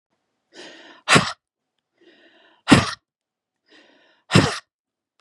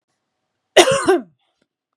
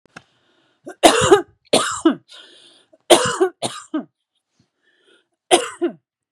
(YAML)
exhalation_length: 5.2 s
exhalation_amplitude: 32768
exhalation_signal_mean_std_ratio: 0.25
cough_length: 2.0 s
cough_amplitude: 32768
cough_signal_mean_std_ratio: 0.34
three_cough_length: 6.3 s
three_cough_amplitude: 32768
three_cough_signal_mean_std_ratio: 0.35
survey_phase: beta (2021-08-13 to 2022-03-07)
age: 45-64
gender: Female
wearing_mask: 'No'
symptom_sore_throat: true
smoker_status: Never smoked
respiratory_condition_asthma: false
respiratory_condition_other: false
recruitment_source: Test and Trace
submission_delay: 1 day
covid_test_result: Negative
covid_test_method: RT-qPCR